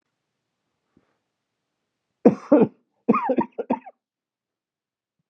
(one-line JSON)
{"cough_length": "5.3 s", "cough_amplitude": 28909, "cough_signal_mean_std_ratio": 0.25, "survey_phase": "beta (2021-08-13 to 2022-03-07)", "age": "45-64", "gender": "Male", "wearing_mask": "No", "symptom_cough_any": true, "symptom_new_continuous_cough": true, "symptom_sore_throat": true, "symptom_fatigue": true, "symptom_headache": true, "symptom_change_to_sense_of_smell_or_taste": true, "symptom_onset": "3 days", "smoker_status": "Never smoked", "respiratory_condition_asthma": false, "respiratory_condition_other": false, "recruitment_source": "Test and Trace", "submission_delay": "1 day", "covid_test_result": "Positive", "covid_test_method": "RT-qPCR", "covid_ct_value": 19.7, "covid_ct_gene": "ORF1ab gene"}